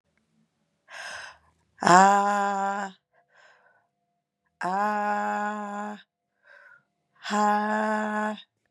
exhalation_length: 8.7 s
exhalation_amplitude: 26315
exhalation_signal_mean_std_ratio: 0.45
survey_phase: beta (2021-08-13 to 2022-03-07)
age: 45-64
gender: Female
wearing_mask: 'No'
symptom_none: true
smoker_status: Current smoker (1 to 10 cigarettes per day)
respiratory_condition_asthma: false
respiratory_condition_other: false
recruitment_source: REACT
submission_delay: 2 days
covid_test_result: Negative
covid_test_method: RT-qPCR
influenza_a_test_result: Negative
influenza_b_test_result: Negative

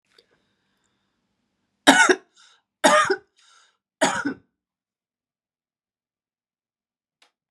three_cough_length: 7.5 s
three_cough_amplitude: 32767
three_cough_signal_mean_std_ratio: 0.25
survey_phase: beta (2021-08-13 to 2022-03-07)
age: 45-64
gender: Female
wearing_mask: 'No'
symptom_cough_any: true
symptom_change_to_sense_of_smell_or_taste: true
smoker_status: Ex-smoker
respiratory_condition_asthma: false
respiratory_condition_other: false
recruitment_source: REACT
submission_delay: 1 day
covid_test_result: Negative
covid_test_method: RT-qPCR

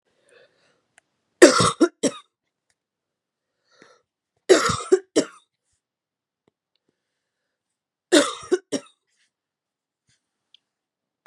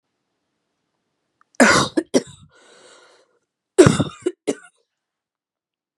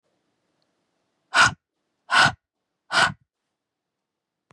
three_cough_length: 11.3 s
three_cough_amplitude: 32768
three_cough_signal_mean_std_ratio: 0.23
cough_length: 6.0 s
cough_amplitude: 32768
cough_signal_mean_std_ratio: 0.26
exhalation_length: 4.5 s
exhalation_amplitude: 23532
exhalation_signal_mean_std_ratio: 0.28
survey_phase: beta (2021-08-13 to 2022-03-07)
age: 18-44
gender: Female
wearing_mask: 'No'
symptom_cough_any: true
symptom_runny_or_blocked_nose: true
symptom_sore_throat: true
symptom_onset: 12 days
smoker_status: Ex-smoker
respiratory_condition_asthma: false
respiratory_condition_other: false
recruitment_source: REACT
submission_delay: 1 day
covid_test_result: Negative
covid_test_method: RT-qPCR
influenza_a_test_result: Negative
influenza_b_test_result: Negative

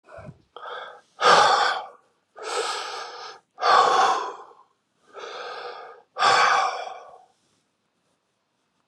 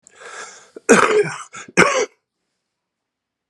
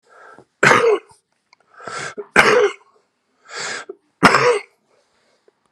exhalation_length: 8.9 s
exhalation_amplitude: 23397
exhalation_signal_mean_std_ratio: 0.46
cough_length: 3.5 s
cough_amplitude: 32768
cough_signal_mean_std_ratio: 0.37
three_cough_length: 5.7 s
three_cough_amplitude: 32768
three_cough_signal_mean_std_ratio: 0.39
survey_phase: beta (2021-08-13 to 2022-03-07)
age: 45-64
gender: Male
wearing_mask: 'No'
symptom_cough_any: true
symptom_runny_or_blocked_nose: true
symptom_shortness_of_breath: true
symptom_sore_throat: true
symptom_fatigue: true
symptom_headache: true
symptom_onset: 4 days
smoker_status: Ex-smoker
respiratory_condition_asthma: false
respiratory_condition_other: true
recruitment_source: Test and Trace
submission_delay: 2 days
covid_test_result: Positive
covid_test_method: RT-qPCR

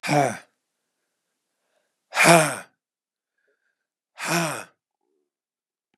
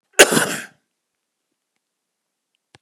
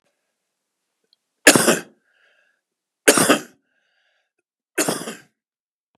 exhalation_length: 6.0 s
exhalation_amplitude: 29234
exhalation_signal_mean_std_ratio: 0.29
cough_length: 2.8 s
cough_amplitude: 32768
cough_signal_mean_std_ratio: 0.22
three_cough_length: 6.0 s
three_cough_amplitude: 32768
three_cough_signal_mean_std_ratio: 0.26
survey_phase: beta (2021-08-13 to 2022-03-07)
age: 65+
gender: Male
wearing_mask: 'No'
symptom_none: true
smoker_status: Never smoked
respiratory_condition_asthma: false
respiratory_condition_other: false
recruitment_source: REACT
submission_delay: 2 days
covid_test_result: Negative
covid_test_method: RT-qPCR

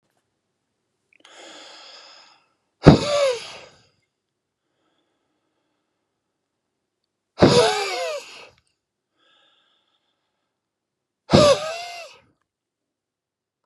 exhalation_length: 13.7 s
exhalation_amplitude: 32768
exhalation_signal_mean_std_ratio: 0.25
survey_phase: beta (2021-08-13 to 2022-03-07)
age: 65+
gender: Male
wearing_mask: 'No'
symptom_none: true
smoker_status: Current smoker (e-cigarettes or vapes only)
respiratory_condition_asthma: true
respiratory_condition_other: false
recruitment_source: REACT
submission_delay: 2 days
covid_test_result: Negative
covid_test_method: RT-qPCR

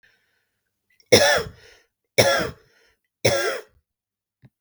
three_cough_length: 4.6 s
three_cough_amplitude: 32768
three_cough_signal_mean_std_ratio: 0.34
survey_phase: beta (2021-08-13 to 2022-03-07)
age: 45-64
gender: Female
wearing_mask: 'No'
symptom_headache: true
symptom_onset: 3 days
smoker_status: Never smoked
respiratory_condition_asthma: false
respiratory_condition_other: false
recruitment_source: Test and Trace
submission_delay: 1 day
covid_test_result: Negative
covid_test_method: ePCR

